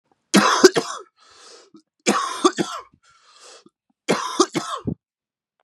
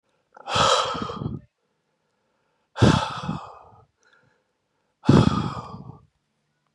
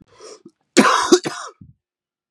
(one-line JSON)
{"three_cough_length": "5.6 s", "three_cough_amplitude": 32768, "three_cough_signal_mean_std_ratio": 0.36, "exhalation_length": "6.7 s", "exhalation_amplitude": 25817, "exhalation_signal_mean_std_ratio": 0.36, "cough_length": "2.3 s", "cough_amplitude": 32768, "cough_signal_mean_std_ratio": 0.35, "survey_phase": "beta (2021-08-13 to 2022-03-07)", "age": "18-44", "gender": "Male", "wearing_mask": "No", "symptom_cough_any": true, "symptom_new_continuous_cough": true, "symptom_runny_or_blocked_nose": true, "symptom_fatigue": true, "symptom_headache": true, "symptom_other": true, "smoker_status": "Never smoked", "respiratory_condition_asthma": false, "respiratory_condition_other": false, "recruitment_source": "Test and Trace", "submission_delay": "2 days", "covid_test_result": "Positive", "covid_test_method": "LFT"}